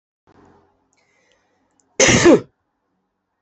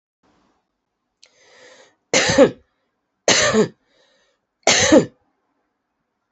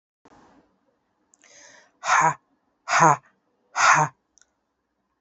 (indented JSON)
{
  "cough_length": "3.4 s",
  "cough_amplitude": 31333,
  "cough_signal_mean_std_ratio": 0.28,
  "three_cough_length": "6.3 s",
  "three_cough_amplitude": 32768,
  "three_cough_signal_mean_std_ratio": 0.33,
  "exhalation_length": "5.2 s",
  "exhalation_amplitude": 27727,
  "exhalation_signal_mean_std_ratio": 0.32,
  "survey_phase": "beta (2021-08-13 to 2022-03-07)",
  "age": "45-64",
  "gender": "Female",
  "wearing_mask": "No",
  "symptom_cough_any": true,
  "symptom_new_continuous_cough": true,
  "symptom_shortness_of_breath": true,
  "symptom_sore_throat": true,
  "symptom_fatigue": true,
  "symptom_headache": true,
  "symptom_change_to_sense_of_smell_or_taste": true,
  "symptom_loss_of_taste": true,
  "symptom_onset": "3 days",
  "smoker_status": "Never smoked",
  "respiratory_condition_asthma": false,
  "respiratory_condition_other": false,
  "recruitment_source": "Test and Trace",
  "submission_delay": "2 days",
  "covid_test_result": "Positive",
  "covid_test_method": "RT-qPCR",
  "covid_ct_value": 21.1,
  "covid_ct_gene": "N gene",
  "covid_ct_mean": 21.6,
  "covid_viral_load": "80000 copies/ml",
  "covid_viral_load_category": "Low viral load (10K-1M copies/ml)"
}